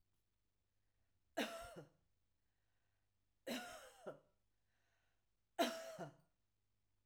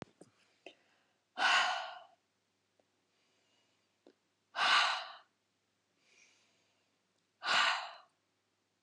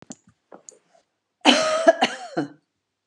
three_cough_length: 7.1 s
three_cough_amplitude: 1624
three_cough_signal_mean_std_ratio: 0.31
exhalation_length: 8.8 s
exhalation_amplitude: 5135
exhalation_signal_mean_std_ratio: 0.32
cough_length: 3.1 s
cough_amplitude: 29872
cough_signal_mean_std_ratio: 0.35
survey_phase: alpha (2021-03-01 to 2021-08-12)
age: 45-64
gender: Female
wearing_mask: 'No'
symptom_none: true
smoker_status: Never smoked
respiratory_condition_asthma: false
respiratory_condition_other: false
recruitment_source: REACT
submission_delay: 1 day
covid_test_result: Negative
covid_test_method: RT-qPCR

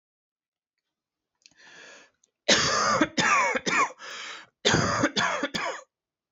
cough_length: 6.3 s
cough_amplitude: 16338
cough_signal_mean_std_ratio: 0.52
survey_phase: beta (2021-08-13 to 2022-03-07)
age: 18-44
gender: Male
wearing_mask: 'No'
symptom_none: true
smoker_status: Never smoked
respiratory_condition_asthma: false
respiratory_condition_other: false
recruitment_source: REACT
submission_delay: 3 days
covid_test_result: Negative
covid_test_method: RT-qPCR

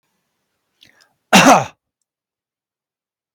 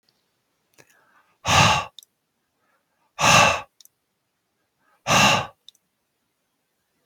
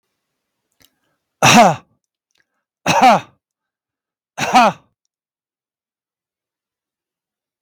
cough_length: 3.3 s
cough_amplitude: 32768
cough_signal_mean_std_ratio: 0.25
exhalation_length: 7.1 s
exhalation_amplitude: 31696
exhalation_signal_mean_std_ratio: 0.32
three_cough_length: 7.6 s
three_cough_amplitude: 32768
three_cough_signal_mean_std_ratio: 0.28
survey_phase: beta (2021-08-13 to 2022-03-07)
age: 45-64
gender: Male
wearing_mask: 'No'
symptom_none: true
smoker_status: Never smoked
respiratory_condition_asthma: false
respiratory_condition_other: false
recruitment_source: REACT
submission_delay: 1 day
covid_test_result: Negative
covid_test_method: RT-qPCR
influenza_a_test_result: Negative
influenza_b_test_result: Negative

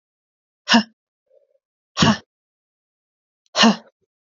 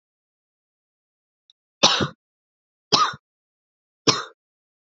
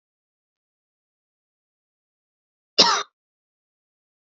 exhalation_length: 4.4 s
exhalation_amplitude: 29146
exhalation_signal_mean_std_ratio: 0.26
three_cough_length: 4.9 s
three_cough_amplitude: 30188
three_cough_signal_mean_std_ratio: 0.25
cough_length: 4.3 s
cough_amplitude: 32768
cough_signal_mean_std_ratio: 0.17
survey_phase: beta (2021-08-13 to 2022-03-07)
age: 18-44
gender: Female
wearing_mask: 'No'
symptom_cough_any: true
symptom_runny_or_blocked_nose: true
symptom_sore_throat: true
symptom_fatigue: true
symptom_headache: true
symptom_onset: 4 days
smoker_status: Never smoked
respiratory_condition_asthma: false
respiratory_condition_other: false
recruitment_source: Test and Trace
submission_delay: 1 day
covid_test_result: Positive
covid_test_method: RT-qPCR
covid_ct_value: 16.2
covid_ct_gene: N gene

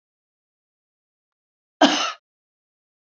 cough_length: 3.2 s
cough_amplitude: 28707
cough_signal_mean_std_ratio: 0.21
survey_phase: beta (2021-08-13 to 2022-03-07)
age: 65+
gender: Female
wearing_mask: 'No'
symptom_none: true
smoker_status: Never smoked
respiratory_condition_asthma: false
respiratory_condition_other: false
recruitment_source: REACT
submission_delay: 1 day
covid_test_result: Negative
covid_test_method: RT-qPCR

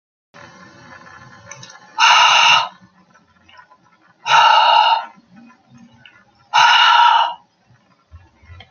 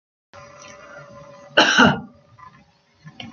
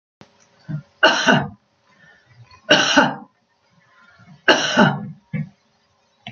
exhalation_length: 8.7 s
exhalation_amplitude: 32768
exhalation_signal_mean_std_ratio: 0.46
cough_length: 3.3 s
cough_amplitude: 30377
cough_signal_mean_std_ratio: 0.32
three_cough_length: 6.3 s
three_cough_amplitude: 29796
three_cough_signal_mean_std_ratio: 0.39
survey_phase: beta (2021-08-13 to 2022-03-07)
age: 65+
gender: Female
wearing_mask: 'No'
symptom_loss_of_taste: true
smoker_status: Never smoked
respiratory_condition_asthma: false
respiratory_condition_other: false
recruitment_source: REACT
submission_delay: 2 days
covid_test_result: Negative
covid_test_method: RT-qPCR
influenza_a_test_result: Negative
influenza_b_test_result: Negative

